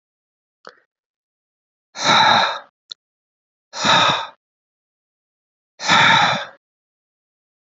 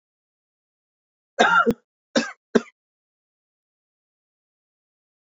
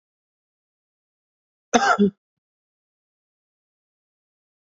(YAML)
exhalation_length: 7.8 s
exhalation_amplitude: 27879
exhalation_signal_mean_std_ratio: 0.37
three_cough_length: 5.2 s
three_cough_amplitude: 30981
three_cough_signal_mean_std_ratio: 0.23
cough_length: 4.7 s
cough_amplitude: 26442
cough_signal_mean_std_ratio: 0.2
survey_phase: beta (2021-08-13 to 2022-03-07)
age: 18-44
gender: Male
wearing_mask: 'No'
symptom_cough_any: true
symptom_runny_or_blocked_nose: true
symptom_sore_throat: true
symptom_fatigue: true
symptom_fever_high_temperature: true
symptom_headache: true
symptom_onset: 3 days
smoker_status: Never smoked
respiratory_condition_asthma: false
respiratory_condition_other: false
recruitment_source: Test and Trace
submission_delay: 1 day
covid_test_result: Positive
covid_test_method: RT-qPCR
covid_ct_value: 23.8
covid_ct_gene: N gene